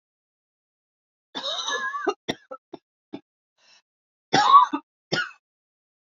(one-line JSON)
{"cough_length": "6.1 s", "cough_amplitude": 23310, "cough_signal_mean_std_ratio": 0.3, "survey_phase": "beta (2021-08-13 to 2022-03-07)", "age": "18-44", "gender": "Female", "wearing_mask": "No", "symptom_cough_any": true, "symptom_runny_or_blocked_nose": true, "symptom_fatigue": true, "symptom_headache": true, "symptom_other": true, "smoker_status": "Never smoked", "respiratory_condition_asthma": false, "respiratory_condition_other": false, "recruitment_source": "Test and Trace", "submission_delay": "1 day", "covid_test_result": "Positive", "covid_test_method": "RT-qPCR", "covid_ct_value": 20.5, "covid_ct_gene": "ORF1ab gene"}